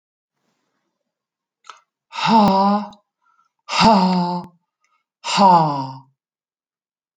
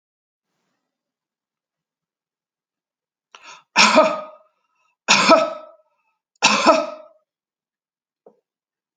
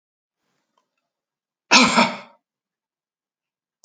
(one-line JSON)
{"exhalation_length": "7.2 s", "exhalation_amplitude": 27993, "exhalation_signal_mean_std_ratio": 0.42, "three_cough_length": "9.0 s", "three_cough_amplitude": 32610, "three_cough_signal_mean_std_ratio": 0.29, "cough_length": "3.8 s", "cough_amplitude": 32217, "cough_signal_mean_std_ratio": 0.24, "survey_phase": "alpha (2021-03-01 to 2021-08-12)", "age": "45-64", "gender": "Female", "wearing_mask": "Yes", "symptom_none": true, "smoker_status": "Never smoked", "respiratory_condition_asthma": false, "respiratory_condition_other": false, "recruitment_source": "REACT", "submission_delay": "1 day", "covid_test_result": "Negative", "covid_test_method": "RT-qPCR"}